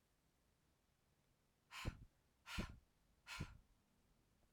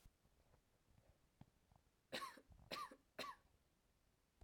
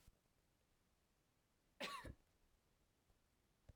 {"exhalation_length": "4.5 s", "exhalation_amplitude": 764, "exhalation_signal_mean_std_ratio": 0.34, "three_cough_length": "4.4 s", "three_cough_amplitude": 627, "three_cough_signal_mean_std_ratio": 0.39, "cough_length": "3.8 s", "cough_amplitude": 713, "cough_signal_mean_std_ratio": 0.32, "survey_phase": "beta (2021-08-13 to 2022-03-07)", "age": "18-44", "gender": "Female", "wearing_mask": "No", "symptom_runny_or_blocked_nose": true, "symptom_fatigue": true, "symptom_onset": "2 days", "smoker_status": "Never smoked", "respiratory_condition_asthma": false, "respiratory_condition_other": false, "recruitment_source": "Test and Trace", "submission_delay": "2 days", "covid_test_result": "Positive", "covid_test_method": "RT-qPCR"}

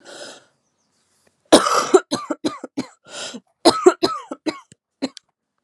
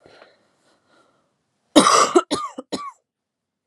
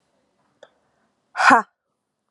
{"cough_length": "5.6 s", "cough_amplitude": 32768, "cough_signal_mean_std_ratio": 0.32, "three_cough_length": "3.7 s", "three_cough_amplitude": 32767, "three_cough_signal_mean_std_ratio": 0.31, "exhalation_length": "2.3 s", "exhalation_amplitude": 30789, "exhalation_signal_mean_std_ratio": 0.24, "survey_phase": "alpha (2021-03-01 to 2021-08-12)", "age": "18-44", "gender": "Female", "wearing_mask": "No", "symptom_cough_any": true, "symptom_abdominal_pain": true, "symptom_headache": true, "symptom_onset": "3 days", "smoker_status": "Never smoked", "respiratory_condition_asthma": false, "respiratory_condition_other": false, "recruitment_source": "Test and Trace", "submission_delay": "2 days", "covid_test_result": "Positive", "covid_test_method": "RT-qPCR", "covid_ct_value": 20.1, "covid_ct_gene": "ORF1ab gene", "covid_ct_mean": 20.5, "covid_viral_load": "190000 copies/ml", "covid_viral_load_category": "Low viral load (10K-1M copies/ml)"}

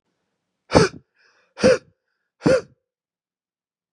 {"exhalation_length": "3.9 s", "exhalation_amplitude": 32768, "exhalation_signal_mean_std_ratio": 0.28, "survey_phase": "beta (2021-08-13 to 2022-03-07)", "age": "18-44", "gender": "Male", "wearing_mask": "No", "symptom_none": true, "smoker_status": "Never smoked", "respiratory_condition_asthma": false, "respiratory_condition_other": false, "recruitment_source": "REACT", "submission_delay": "3 days", "covid_test_result": "Negative", "covid_test_method": "RT-qPCR", "influenza_a_test_result": "Negative", "influenza_b_test_result": "Negative"}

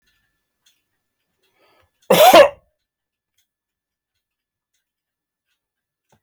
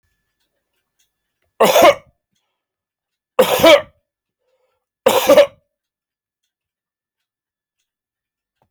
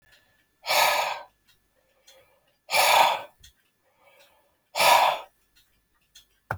{"cough_length": "6.2 s", "cough_amplitude": 32279, "cough_signal_mean_std_ratio": 0.2, "three_cough_length": "8.7 s", "three_cough_amplitude": 32767, "three_cough_signal_mean_std_ratio": 0.28, "exhalation_length": "6.6 s", "exhalation_amplitude": 16825, "exhalation_signal_mean_std_ratio": 0.38, "survey_phase": "beta (2021-08-13 to 2022-03-07)", "age": "45-64", "gender": "Male", "wearing_mask": "No", "symptom_none": true, "smoker_status": "Never smoked", "respiratory_condition_asthma": false, "respiratory_condition_other": false, "recruitment_source": "REACT", "submission_delay": "4 days", "covid_test_result": "Negative", "covid_test_method": "RT-qPCR"}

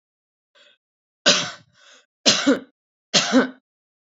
{"three_cough_length": "4.1 s", "three_cough_amplitude": 31895, "three_cough_signal_mean_std_ratio": 0.35, "survey_phase": "beta (2021-08-13 to 2022-03-07)", "age": "45-64", "gender": "Female", "wearing_mask": "No", "symptom_sore_throat": true, "symptom_onset": "3 days", "smoker_status": "Never smoked", "respiratory_condition_asthma": true, "respiratory_condition_other": false, "recruitment_source": "Test and Trace", "submission_delay": "2 days", "covid_test_result": "Positive", "covid_test_method": "RT-qPCR", "covid_ct_value": 25.9, "covid_ct_gene": "ORF1ab gene"}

